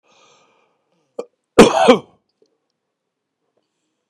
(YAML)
cough_length: 4.1 s
cough_amplitude: 32768
cough_signal_mean_std_ratio: 0.23
survey_phase: beta (2021-08-13 to 2022-03-07)
age: 45-64
gender: Male
wearing_mask: 'No'
symptom_cough_any: true
symptom_runny_or_blocked_nose: true
symptom_fatigue: true
symptom_fever_high_temperature: true
symptom_onset: 2 days
smoker_status: Current smoker (11 or more cigarettes per day)
respiratory_condition_asthma: false
respiratory_condition_other: false
recruitment_source: Test and Trace
submission_delay: 2 days
covid_test_result: Positive
covid_test_method: RT-qPCR
covid_ct_value: 27.2
covid_ct_gene: N gene